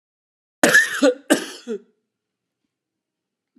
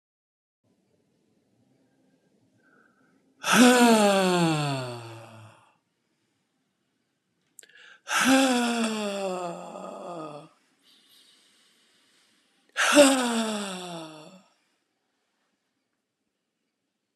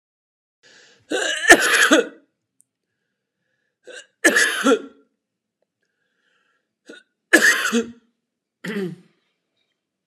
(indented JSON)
{
  "cough_length": "3.6 s",
  "cough_amplitude": 31864,
  "cough_signal_mean_std_ratio": 0.32,
  "exhalation_length": "17.2 s",
  "exhalation_amplitude": 24383,
  "exhalation_signal_mean_std_ratio": 0.37,
  "three_cough_length": "10.1 s",
  "three_cough_amplitude": 32768,
  "three_cough_signal_mean_std_ratio": 0.33,
  "survey_phase": "beta (2021-08-13 to 2022-03-07)",
  "age": "45-64",
  "gender": "Male",
  "wearing_mask": "No",
  "symptom_cough_any": true,
  "symptom_onset": "12 days",
  "smoker_status": "Never smoked",
  "respiratory_condition_asthma": false,
  "respiratory_condition_other": false,
  "recruitment_source": "REACT",
  "submission_delay": "2 days",
  "covid_test_result": "Positive",
  "covid_test_method": "RT-qPCR",
  "covid_ct_value": 32.0,
  "covid_ct_gene": "N gene",
  "influenza_a_test_result": "Negative",
  "influenza_b_test_result": "Negative"
}